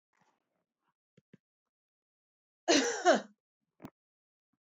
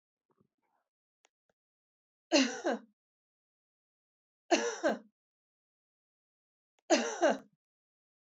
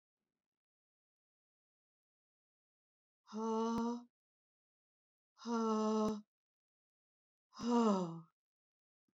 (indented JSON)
{
  "cough_length": "4.6 s",
  "cough_amplitude": 8322,
  "cough_signal_mean_std_ratio": 0.24,
  "three_cough_length": "8.4 s",
  "three_cough_amplitude": 8554,
  "three_cough_signal_mean_std_ratio": 0.27,
  "exhalation_length": "9.1 s",
  "exhalation_amplitude": 2572,
  "exhalation_signal_mean_std_ratio": 0.39,
  "survey_phase": "alpha (2021-03-01 to 2021-08-12)",
  "age": "45-64",
  "gender": "Female",
  "wearing_mask": "No",
  "symptom_fatigue": true,
  "smoker_status": "Never smoked",
  "respiratory_condition_asthma": true,
  "respiratory_condition_other": false,
  "recruitment_source": "REACT",
  "submission_delay": "2 days",
  "covid_test_result": "Negative",
  "covid_test_method": "RT-qPCR"
}